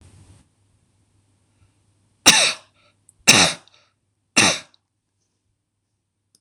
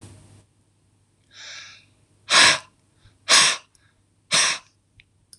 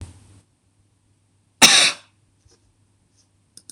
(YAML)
three_cough_length: 6.4 s
three_cough_amplitude: 26028
three_cough_signal_mean_std_ratio: 0.26
exhalation_length: 5.4 s
exhalation_amplitude: 25989
exhalation_signal_mean_std_ratio: 0.32
cough_length: 3.7 s
cough_amplitude: 26028
cough_signal_mean_std_ratio: 0.23
survey_phase: beta (2021-08-13 to 2022-03-07)
age: 45-64
gender: Male
wearing_mask: 'No'
symptom_none: true
smoker_status: Never smoked
respiratory_condition_asthma: false
respiratory_condition_other: false
recruitment_source: REACT
submission_delay: 3 days
covid_test_result: Negative
covid_test_method: RT-qPCR
influenza_a_test_result: Negative
influenza_b_test_result: Negative